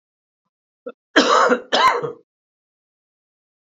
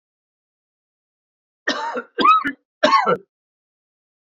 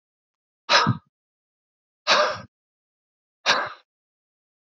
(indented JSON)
{
  "cough_length": "3.7 s",
  "cough_amplitude": 32768,
  "cough_signal_mean_std_ratio": 0.37,
  "three_cough_length": "4.3 s",
  "three_cough_amplitude": 31173,
  "three_cough_signal_mean_std_ratio": 0.36,
  "exhalation_length": "4.8 s",
  "exhalation_amplitude": 24678,
  "exhalation_signal_mean_std_ratio": 0.31,
  "survey_phase": "beta (2021-08-13 to 2022-03-07)",
  "age": "45-64",
  "gender": "Male",
  "wearing_mask": "No",
  "symptom_cough_any": true,
  "symptom_runny_or_blocked_nose": true,
  "symptom_sore_throat": true,
  "symptom_change_to_sense_of_smell_or_taste": true,
  "symptom_loss_of_taste": true,
  "symptom_other": true,
  "symptom_onset": "4 days",
  "smoker_status": "Never smoked",
  "respiratory_condition_asthma": false,
  "respiratory_condition_other": false,
  "recruitment_source": "Test and Trace",
  "submission_delay": "2 days",
  "covid_test_result": "Positive",
  "covid_test_method": "RT-qPCR",
  "covid_ct_value": 10.9,
  "covid_ct_gene": "ORF1ab gene",
  "covid_ct_mean": 11.1,
  "covid_viral_load": "230000000 copies/ml",
  "covid_viral_load_category": "High viral load (>1M copies/ml)"
}